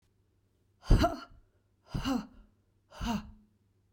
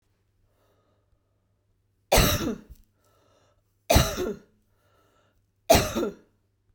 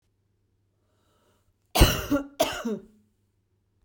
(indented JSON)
{
  "exhalation_length": "3.9 s",
  "exhalation_amplitude": 10087,
  "exhalation_signal_mean_std_ratio": 0.32,
  "three_cough_length": "6.7 s",
  "three_cough_amplitude": 21309,
  "three_cough_signal_mean_std_ratio": 0.31,
  "cough_length": "3.8 s",
  "cough_amplitude": 22733,
  "cough_signal_mean_std_ratio": 0.29,
  "survey_phase": "beta (2021-08-13 to 2022-03-07)",
  "age": "45-64",
  "gender": "Female",
  "wearing_mask": "No",
  "symptom_none": true,
  "smoker_status": "Ex-smoker",
  "respiratory_condition_asthma": false,
  "respiratory_condition_other": false,
  "recruitment_source": "REACT",
  "submission_delay": "3 days",
  "covid_test_result": "Negative",
  "covid_test_method": "RT-qPCR",
  "influenza_a_test_result": "Negative",
  "influenza_b_test_result": "Negative"
}